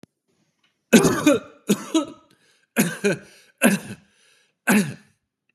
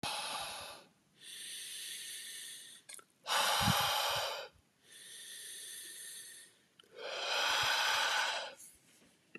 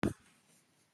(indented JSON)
{
  "three_cough_length": "5.5 s",
  "three_cough_amplitude": 30906,
  "three_cough_signal_mean_std_ratio": 0.39,
  "exhalation_length": "9.4 s",
  "exhalation_amplitude": 4034,
  "exhalation_signal_mean_std_ratio": 0.62,
  "cough_length": "0.9 s",
  "cough_amplitude": 4594,
  "cough_signal_mean_std_ratio": 0.25,
  "survey_phase": "beta (2021-08-13 to 2022-03-07)",
  "age": "45-64",
  "gender": "Male",
  "wearing_mask": "No",
  "symptom_none": true,
  "smoker_status": "Ex-smoker",
  "respiratory_condition_asthma": false,
  "respiratory_condition_other": false,
  "recruitment_source": "REACT",
  "submission_delay": "1 day",
  "covid_test_result": "Negative",
  "covid_test_method": "RT-qPCR",
  "influenza_a_test_result": "Negative",
  "influenza_b_test_result": "Negative"
}